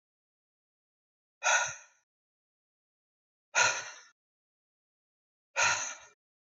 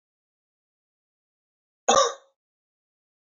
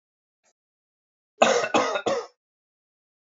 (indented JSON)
{
  "exhalation_length": "6.6 s",
  "exhalation_amplitude": 7739,
  "exhalation_signal_mean_std_ratio": 0.29,
  "cough_length": "3.3 s",
  "cough_amplitude": 17867,
  "cough_signal_mean_std_ratio": 0.2,
  "three_cough_length": "3.2 s",
  "three_cough_amplitude": 26206,
  "three_cough_signal_mean_std_ratio": 0.35,
  "survey_phase": "beta (2021-08-13 to 2022-03-07)",
  "age": "18-44",
  "gender": "Male",
  "wearing_mask": "No",
  "symptom_none": true,
  "smoker_status": "Never smoked",
  "respiratory_condition_asthma": false,
  "respiratory_condition_other": false,
  "recruitment_source": "Test and Trace",
  "submission_delay": "1 day",
  "covid_test_result": "Negative",
  "covid_test_method": "LFT"
}